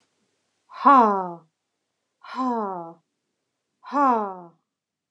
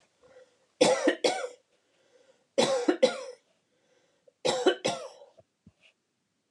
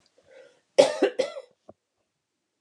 {"exhalation_length": "5.1 s", "exhalation_amplitude": 25213, "exhalation_signal_mean_std_ratio": 0.35, "three_cough_length": "6.5 s", "three_cough_amplitude": 12530, "three_cough_signal_mean_std_ratio": 0.37, "cough_length": "2.6 s", "cough_amplitude": 27161, "cough_signal_mean_std_ratio": 0.26, "survey_phase": "alpha (2021-03-01 to 2021-08-12)", "age": "18-44", "gender": "Female", "wearing_mask": "No", "symptom_fatigue": true, "symptom_onset": "12 days", "smoker_status": "Never smoked", "respiratory_condition_asthma": false, "respiratory_condition_other": false, "recruitment_source": "REACT", "submission_delay": "1 day", "covid_test_result": "Negative", "covid_test_method": "RT-qPCR"}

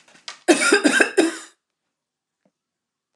{"cough_length": "3.2 s", "cough_amplitude": 29124, "cough_signal_mean_std_ratio": 0.38, "survey_phase": "alpha (2021-03-01 to 2021-08-12)", "age": "65+", "gender": "Female", "wearing_mask": "No", "symptom_none": true, "smoker_status": "Never smoked", "respiratory_condition_asthma": false, "respiratory_condition_other": false, "recruitment_source": "REACT", "submission_delay": "2 days", "covid_test_result": "Negative", "covid_test_method": "RT-qPCR"}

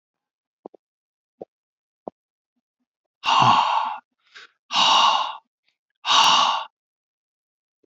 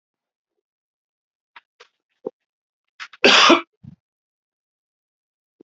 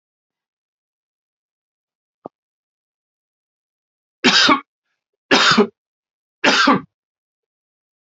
{"exhalation_length": "7.9 s", "exhalation_amplitude": 22525, "exhalation_signal_mean_std_ratio": 0.4, "cough_length": "5.6 s", "cough_amplitude": 32754, "cough_signal_mean_std_ratio": 0.21, "three_cough_length": "8.0 s", "three_cough_amplitude": 31146, "three_cough_signal_mean_std_ratio": 0.29, "survey_phase": "beta (2021-08-13 to 2022-03-07)", "age": "45-64", "gender": "Male", "wearing_mask": "No", "symptom_none": true, "smoker_status": "Never smoked", "respiratory_condition_asthma": false, "respiratory_condition_other": false, "recruitment_source": "REACT", "submission_delay": "1 day", "covid_test_result": "Negative", "covid_test_method": "RT-qPCR", "influenza_a_test_result": "Unknown/Void", "influenza_b_test_result": "Unknown/Void"}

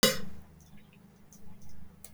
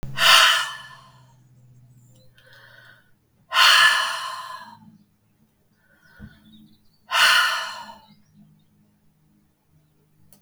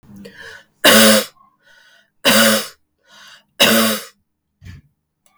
{"cough_length": "2.1 s", "cough_amplitude": 12225, "cough_signal_mean_std_ratio": 0.51, "exhalation_length": "10.4 s", "exhalation_amplitude": 32558, "exhalation_signal_mean_std_ratio": 0.35, "three_cough_length": "5.4 s", "three_cough_amplitude": 32768, "three_cough_signal_mean_std_ratio": 0.41, "survey_phase": "beta (2021-08-13 to 2022-03-07)", "age": "45-64", "gender": "Female", "wearing_mask": "No", "symptom_cough_any": true, "symptom_runny_or_blocked_nose": true, "symptom_fatigue": true, "symptom_fever_high_temperature": true, "symptom_headache": true, "symptom_change_to_sense_of_smell_or_taste": true, "symptom_other": true, "symptom_onset": "4 days", "smoker_status": "Ex-smoker", "respiratory_condition_asthma": false, "respiratory_condition_other": false, "recruitment_source": "Test and Trace", "submission_delay": "2 days", "covid_test_result": "Positive", "covid_test_method": "RT-qPCR", "covid_ct_value": 20.9, "covid_ct_gene": "ORF1ab gene", "covid_ct_mean": 21.8, "covid_viral_load": "73000 copies/ml", "covid_viral_load_category": "Low viral load (10K-1M copies/ml)"}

